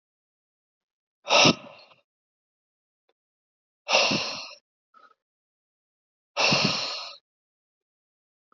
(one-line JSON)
{"exhalation_length": "8.5 s", "exhalation_amplitude": 20569, "exhalation_signal_mean_std_ratio": 0.3, "survey_phase": "alpha (2021-03-01 to 2021-08-12)", "age": "18-44", "gender": "Male", "wearing_mask": "No", "symptom_cough_any": true, "symptom_headache": true, "smoker_status": "Never smoked", "respiratory_condition_asthma": false, "respiratory_condition_other": false, "recruitment_source": "Test and Trace", "submission_delay": "1 day", "covid_test_result": "Positive", "covid_test_method": "RT-qPCR", "covid_ct_value": 13.3, "covid_ct_gene": "ORF1ab gene", "covid_ct_mean": 14.1, "covid_viral_load": "25000000 copies/ml", "covid_viral_load_category": "High viral load (>1M copies/ml)"}